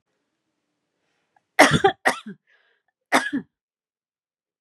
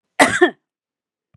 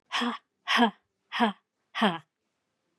{"three_cough_length": "4.6 s", "three_cough_amplitude": 32767, "three_cough_signal_mean_std_ratio": 0.25, "cough_length": "1.4 s", "cough_amplitude": 32768, "cough_signal_mean_std_ratio": 0.32, "exhalation_length": "3.0 s", "exhalation_amplitude": 13331, "exhalation_signal_mean_std_ratio": 0.41, "survey_phase": "beta (2021-08-13 to 2022-03-07)", "age": "45-64", "gender": "Female", "wearing_mask": "No", "symptom_none": true, "symptom_onset": "7 days", "smoker_status": "Never smoked", "respiratory_condition_asthma": false, "respiratory_condition_other": false, "recruitment_source": "REACT", "submission_delay": "3 days", "covid_test_result": "Negative", "covid_test_method": "RT-qPCR", "covid_ct_value": 41.0, "covid_ct_gene": "N gene"}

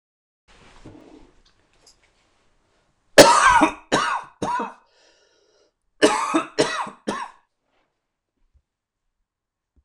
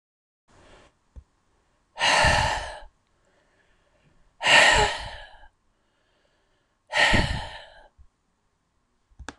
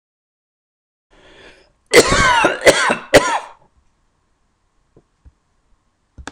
{"three_cough_length": "9.8 s", "three_cough_amplitude": 26028, "three_cough_signal_mean_std_ratio": 0.3, "exhalation_length": "9.4 s", "exhalation_amplitude": 22278, "exhalation_signal_mean_std_ratio": 0.35, "cough_length": "6.3 s", "cough_amplitude": 26028, "cough_signal_mean_std_ratio": 0.34, "survey_phase": "beta (2021-08-13 to 2022-03-07)", "age": "65+", "gender": "Male", "wearing_mask": "No", "symptom_none": true, "smoker_status": "Never smoked", "respiratory_condition_asthma": false, "respiratory_condition_other": false, "recruitment_source": "REACT", "submission_delay": "1 day", "covid_test_result": "Negative", "covid_test_method": "RT-qPCR"}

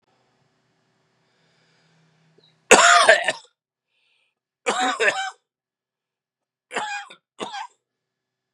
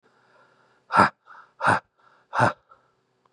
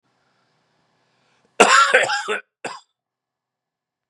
{"three_cough_length": "8.5 s", "three_cough_amplitude": 32768, "three_cough_signal_mean_std_ratio": 0.28, "exhalation_length": "3.3 s", "exhalation_amplitude": 24720, "exhalation_signal_mean_std_ratio": 0.31, "cough_length": "4.1 s", "cough_amplitude": 32768, "cough_signal_mean_std_ratio": 0.31, "survey_phase": "beta (2021-08-13 to 2022-03-07)", "age": "45-64", "gender": "Male", "wearing_mask": "No", "symptom_cough_any": true, "symptom_shortness_of_breath": true, "symptom_sore_throat": true, "symptom_fatigue": true, "symptom_fever_high_temperature": true, "symptom_headache": true, "symptom_change_to_sense_of_smell_or_taste": true, "symptom_loss_of_taste": true, "smoker_status": "Never smoked", "respiratory_condition_asthma": false, "respiratory_condition_other": false, "recruitment_source": "Test and Trace", "submission_delay": "1 day", "covid_test_result": "Positive", "covid_test_method": "RT-qPCR", "covid_ct_value": 16.8, "covid_ct_gene": "ORF1ab gene", "covid_ct_mean": 18.0, "covid_viral_load": "1300000 copies/ml", "covid_viral_load_category": "High viral load (>1M copies/ml)"}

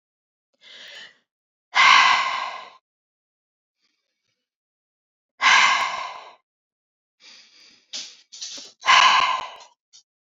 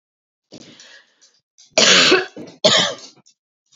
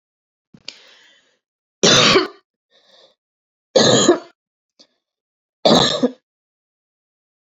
{"exhalation_length": "10.2 s", "exhalation_amplitude": 26251, "exhalation_signal_mean_std_ratio": 0.35, "cough_length": "3.8 s", "cough_amplitude": 30390, "cough_signal_mean_std_ratio": 0.38, "three_cough_length": "7.4 s", "three_cough_amplitude": 32258, "three_cough_signal_mean_std_ratio": 0.33, "survey_phase": "beta (2021-08-13 to 2022-03-07)", "age": "18-44", "gender": "Female", "wearing_mask": "No", "symptom_none": true, "smoker_status": "Ex-smoker", "respiratory_condition_asthma": false, "respiratory_condition_other": false, "recruitment_source": "REACT", "submission_delay": "3 days", "covid_test_result": "Negative", "covid_test_method": "RT-qPCR", "influenza_a_test_result": "Negative", "influenza_b_test_result": "Negative"}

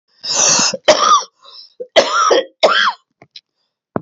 {"three_cough_length": "4.0 s", "three_cough_amplitude": 32432, "three_cough_signal_mean_std_ratio": 0.55, "survey_phase": "alpha (2021-03-01 to 2021-08-12)", "age": "45-64", "gender": "Male", "wearing_mask": "No", "symptom_cough_any": true, "symptom_fatigue": true, "symptom_fever_high_temperature": true, "symptom_change_to_sense_of_smell_or_taste": true, "symptom_onset": "5 days", "smoker_status": "Never smoked", "respiratory_condition_asthma": true, "respiratory_condition_other": false, "recruitment_source": "Test and Trace", "submission_delay": "2 days", "covid_test_result": "Positive", "covid_test_method": "RT-qPCR", "covid_ct_value": 24.9, "covid_ct_gene": "N gene"}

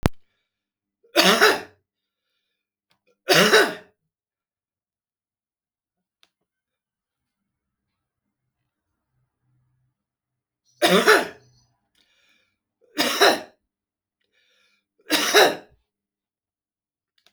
{"three_cough_length": "17.3 s", "three_cough_amplitude": 32768, "three_cough_signal_mean_std_ratio": 0.27, "survey_phase": "beta (2021-08-13 to 2022-03-07)", "age": "65+", "gender": "Male", "wearing_mask": "No", "symptom_cough_any": true, "symptom_runny_or_blocked_nose": true, "symptom_fatigue": true, "symptom_headache": true, "symptom_loss_of_taste": true, "symptom_onset": "8 days", "smoker_status": "Current smoker (e-cigarettes or vapes only)", "respiratory_condition_asthma": false, "respiratory_condition_other": false, "recruitment_source": "Test and Trace", "submission_delay": "2 days", "covid_test_result": "Positive", "covid_test_method": "RT-qPCR", "covid_ct_value": 26.0, "covid_ct_gene": "ORF1ab gene"}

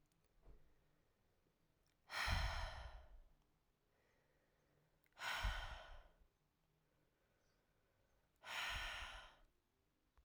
{"exhalation_length": "10.2 s", "exhalation_amplitude": 1087, "exhalation_signal_mean_std_ratio": 0.4, "survey_phase": "alpha (2021-03-01 to 2021-08-12)", "age": "18-44", "gender": "Female", "wearing_mask": "No", "symptom_cough_any": true, "symptom_new_continuous_cough": true, "symptom_shortness_of_breath": true, "symptom_diarrhoea": true, "symptom_headache": true, "symptom_onset": "4 days", "smoker_status": "Never smoked", "respiratory_condition_asthma": true, "respiratory_condition_other": false, "recruitment_source": "Test and Trace", "submission_delay": "1 day", "covid_test_result": "Positive", "covid_test_method": "RT-qPCR", "covid_ct_value": 14.9, "covid_ct_gene": "ORF1ab gene", "covid_ct_mean": 15.3, "covid_viral_load": "9700000 copies/ml", "covid_viral_load_category": "High viral load (>1M copies/ml)"}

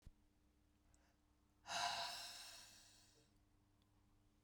{"exhalation_length": "4.4 s", "exhalation_amplitude": 1063, "exhalation_signal_mean_std_ratio": 0.4, "survey_phase": "beta (2021-08-13 to 2022-03-07)", "age": "45-64", "gender": "Female", "wearing_mask": "No", "symptom_none": true, "smoker_status": "Never smoked", "respiratory_condition_asthma": false, "respiratory_condition_other": false, "recruitment_source": "Test and Trace", "submission_delay": "0 days", "covid_test_result": "Negative", "covid_test_method": "LFT"}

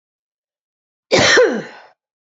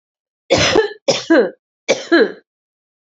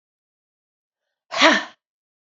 {"cough_length": "2.4 s", "cough_amplitude": 31818, "cough_signal_mean_std_ratio": 0.38, "three_cough_length": "3.2 s", "three_cough_amplitude": 28601, "three_cough_signal_mean_std_ratio": 0.46, "exhalation_length": "2.4 s", "exhalation_amplitude": 27367, "exhalation_signal_mean_std_ratio": 0.25, "survey_phase": "alpha (2021-03-01 to 2021-08-12)", "age": "45-64", "gender": "Female", "wearing_mask": "No", "symptom_none": true, "smoker_status": "Never smoked", "respiratory_condition_asthma": false, "respiratory_condition_other": false, "recruitment_source": "REACT", "submission_delay": "1 day", "covid_test_result": "Negative", "covid_test_method": "RT-qPCR"}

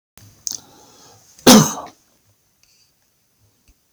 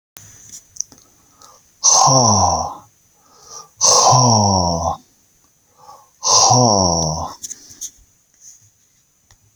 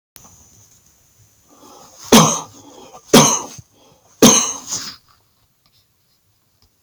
{"cough_length": "3.9 s", "cough_amplitude": 32768, "cough_signal_mean_std_ratio": 0.22, "exhalation_length": "9.6 s", "exhalation_amplitude": 32768, "exhalation_signal_mean_std_ratio": 0.48, "three_cough_length": "6.8 s", "three_cough_amplitude": 32768, "three_cough_signal_mean_std_ratio": 0.3, "survey_phase": "beta (2021-08-13 to 2022-03-07)", "age": "65+", "gender": "Male", "wearing_mask": "No", "symptom_fatigue": true, "smoker_status": "Ex-smoker", "respiratory_condition_asthma": false, "respiratory_condition_other": false, "recruitment_source": "REACT", "submission_delay": "1 day", "covid_test_result": "Negative", "covid_test_method": "RT-qPCR"}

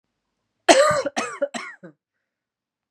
{"three_cough_length": "2.9 s", "three_cough_amplitude": 32767, "three_cough_signal_mean_std_ratio": 0.34, "survey_phase": "beta (2021-08-13 to 2022-03-07)", "age": "18-44", "gender": "Female", "wearing_mask": "No", "symptom_cough_any": true, "symptom_shortness_of_breath": true, "symptom_fatigue": true, "symptom_fever_high_temperature": true, "symptom_headache": true, "symptom_change_to_sense_of_smell_or_taste": true, "symptom_onset": "6 days", "smoker_status": "Current smoker (1 to 10 cigarettes per day)", "respiratory_condition_asthma": false, "respiratory_condition_other": false, "recruitment_source": "Test and Trace", "submission_delay": "2 days", "covid_test_result": "Positive", "covid_test_method": "RT-qPCR", "covid_ct_value": 20.8, "covid_ct_gene": "ORF1ab gene"}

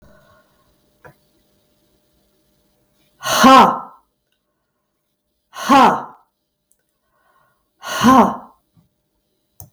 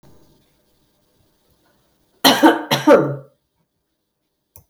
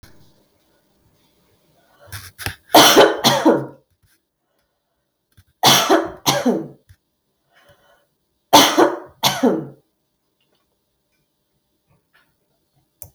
{"exhalation_length": "9.7 s", "exhalation_amplitude": 32768, "exhalation_signal_mean_std_ratio": 0.29, "cough_length": "4.7 s", "cough_amplitude": 32768, "cough_signal_mean_std_ratio": 0.29, "three_cough_length": "13.1 s", "three_cough_amplitude": 32768, "three_cough_signal_mean_std_ratio": 0.33, "survey_phase": "beta (2021-08-13 to 2022-03-07)", "age": "65+", "gender": "Female", "wearing_mask": "No", "symptom_cough_any": true, "symptom_runny_or_blocked_nose": true, "symptom_sore_throat": true, "smoker_status": "Ex-smoker", "respiratory_condition_asthma": false, "respiratory_condition_other": false, "recruitment_source": "Test and Trace", "submission_delay": "2 days", "covid_test_result": "Positive", "covid_test_method": "LFT"}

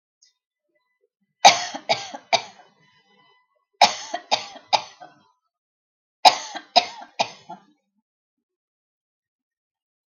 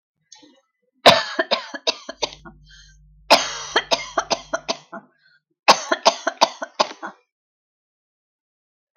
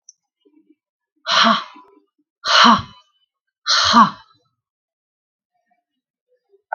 {"three_cough_length": "10.1 s", "three_cough_amplitude": 32768, "three_cough_signal_mean_std_ratio": 0.22, "cough_length": "9.0 s", "cough_amplitude": 32768, "cough_signal_mean_std_ratio": 0.3, "exhalation_length": "6.7 s", "exhalation_amplitude": 32768, "exhalation_signal_mean_std_ratio": 0.32, "survey_phase": "beta (2021-08-13 to 2022-03-07)", "age": "45-64", "gender": "Female", "wearing_mask": "No", "symptom_none": true, "smoker_status": "Current smoker (1 to 10 cigarettes per day)", "respiratory_condition_asthma": false, "respiratory_condition_other": false, "recruitment_source": "REACT", "submission_delay": "5 days", "covid_test_result": "Negative", "covid_test_method": "RT-qPCR", "influenza_a_test_result": "Negative", "influenza_b_test_result": "Negative"}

